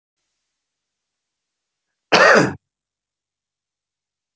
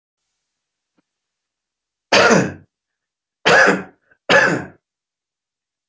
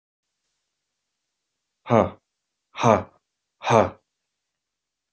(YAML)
cough_length: 4.4 s
cough_amplitude: 27393
cough_signal_mean_std_ratio: 0.23
three_cough_length: 5.9 s
three_cough_amplitude: 29202
three_cough_signal_mean_std_ratio: 0.34
exhalation_length: 5.1 s
exhalation_amplitude: 26294
exhalation_signal_mean_std_ratio: 0.24
survey_phase: beta (2021-08-13 to 2022-03-07)
age: 45-64
gender: Male
wearing_mask: 'No'
symptom_none: true
symptom_onset: 12 days
smoker_status: Never smoked
respiratory_condition_asthma: false
respiratory_condition_other: false
recruitment_source: REACT
submission_delay: 3 days
covid_test_result: Negative
covid_test_method: RT-qPCR
influenza_a_test_result: Negative
influenza_b_test_result: Negative